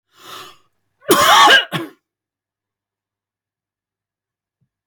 {"cough_length": "4.9 s", "cough_amplitude": 32768, "cough_signal_mean_std_ratio": 0.3, "survey_phase": "beta (2021-08-13 to 2022-03-07)", "age": "45-64", "gender": "Male", "wearing_mask": "No", "symptom_none": true, "smoker_status": "Never smoked", "respiratory_condition_asthma": false, "respiratory_condition_other": false, "recruitment_source": "REACT", "submission_delay": "1 day", "covid_test_result": "Negative", "covid_test_method": "RT-qPCR", "influenza_a_test_result": "Negative", "influenza_b_test_result": "Negative"}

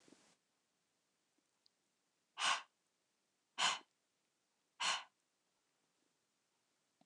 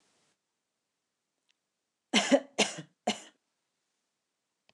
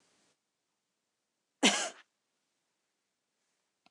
{"exhalation_length": "7.1 s", "exhalation_amplitude": 2521, "exhalation_signal_mean_std_ratio": 0.24, "three_cough_length": "4.7 s", "three_cough_amplitude": 11396, "three_cough_signal_mean_std_ratio": 0.23, "cough_length": "3.9 s", "cough_amplitude": 8947, "cough_signal_mean_std_ratio": 0.18, "survey_phase": "beta (2021-08-13 to 2022-03-07)", "age": "18-44", "gender": "Female", "wearing_mask": "No", "symptom_none": true, "smoker_status": "Never smoked", "respiratory_condition_asthma": false, "respiratory_condition_other": false, "recruitment_source": "REACT", "submission_delay": "1 day", "covid_test_result": "Negative", "covid_test_method": "RT-qPCR"}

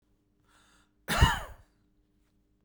{"cough_length": "2.6 s", "cough_amplitude": 12697, "cough_signal_mean_std_ratio": 0.26, "survey_phase": "beta (2021-08-13 to 2022-03-07)", "age": "45-64", "gender": "Male", "wearing_mask": "No", "symptom_none": true, "smoker_status": "Never smoked", "respiratory_condition_asthma": false, "respiratory_condition_other": false, "recruitment_source": "REACT", "submission_delay": "1 day", "covid_test_result": "Negative", "covid_test_method": "RT-qPCR"}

